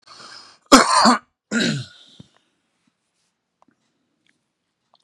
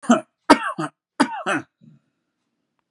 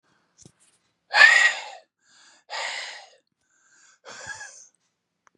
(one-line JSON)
{"cough_length": "5.0 s", "cough_amplitude": 32768, "cough_signal_mean_std_ratio": 0.28, "three_cough_length": "2.9 s", "three_cough_amplitude": 32767, "three_cough_signal_mean_std_ratio": 0.32, "exhalation_length": "5.4 s", "exhalation_amplitude": 28092, "exhalation_signal_mean_std_ratio": 0.27, "survey_phase": "beta (2021-08-13 to 2022-03-07)", "age": "45-64", "gender": "Male", "wearing_mask": "No", "symptom_none": true, "smoker_status": "Ex-smoker", "respiratory_condition_asthma": false, "respiratory_condition_other": false, "recruitment_source": "REACT", "submission_delay": "3 days", "covid_test_result": "Negative", "covid_test_method": "RT-qPCR", "influenza_a_test_result": "Negative", "influenza_b_test_result": "Negative"}